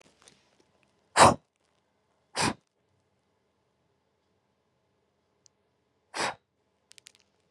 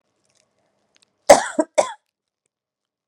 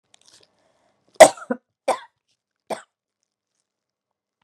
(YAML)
exhalation_length: 7.5 s
exhalation_amplitude: 26449
exhalation_signal_mean_std_ratio: 0.17
cough_length: 3.1 s
cough_amplitude: 32768
cough_signal_mean_std_ratio: 0.2
three_cough_length: 4.4 s
three_cough_amplitude: 32768
three_cough_signal_mean_std_ratio: 0.14
survey_phase: beta (2021-08-13 to 2022-03-07)
age: 45-64
gender: Female
wearing_mask: 'No'
symptom_cough_any: true
symptom_runny_or_blocked_nose: true
symptom_onset: 4 days
smoker_status: Current smoker (1 to 10 cigarettes per day)
respiratory_condition_asthma: false
respiratory_condition_other: false
recruitment_source: Test and Trace
submission_delay: 1 day
covid_test_result: Negative
covid_test_method: RT-qPCR